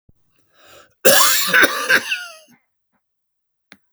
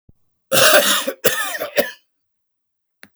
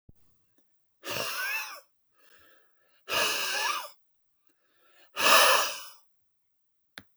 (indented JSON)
{
  "three_cough_length": "3.9 s",
  "three_cough_amplitude": 32768,
  "three_cough_signal_mean_std_ratio": 0.4,
  "cough_length": "3.2 s",
  "cough_amplitude": 32768,
  "cough_signal_mean_std_ratio": 0.44,
  "exhalation_length": "7.2 s",
  "exhalation_amplitude": 17355,
  "exhalation_signal_mean_std_ratio": 0.39,
  "survey_phase": "beta (2021-08-13 to 2022-03-07)",
  "age": "65+",
  "gender": "Male",
  "wearing_mask": "No",
  "symptom_cough_any": true,
  "symptom_fatigue": true,
  "symptom_onset": "9 days",
  "smoker_status": "Never smoked",
  "respiratory_condition_asthma": false,
  "respiratory_condition_other": false,
  "recruitment_source": "Test and Trace",
  "submission_delay": "2 days",
  "covid_test_result": "Positive",
  "covid_test_method": "RT-qPCR"
}